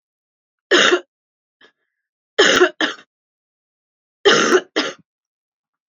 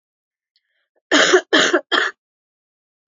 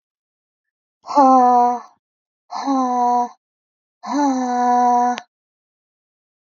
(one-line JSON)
{"three_cough_length": "5.9 s", "three_cough_amplitude": 32768, "three_cough_signal_mean_std_ratio": 0.35, "cough_length": "3.1 s", "cough_amplitude": 28868, "cough_signal_mean_std_ratio": 0.39, "exhalation_length": "6.6 s", "exhalation_amplitude": 25358, "exhalation_signal_mean_std_ratio": 0.52, "survey_phase": "beta (2021-08-13 to 2022-03-07)", "age": "45-64", "gender": "Female", "wearing_mask": "No", "symptom_cough_any": true, "symptom_runny_or_blocked_nose": true, "symptom_sore_throat": true, "symptom_diarrhoea": true, "symptom_fatigue": true, "symptom_fever_high_temperature": true, "symptom_other": true, "smoker_status": "Current smoker (e-cigarettes or vapes only)", "respiratory_condition_asthma": false, "respiratory_condition_other": false, "recruitment_source": "Test and Trace", "submission_delay": "2 days", "covid_test_result": "Positive", "covid_test_method": "LFT"}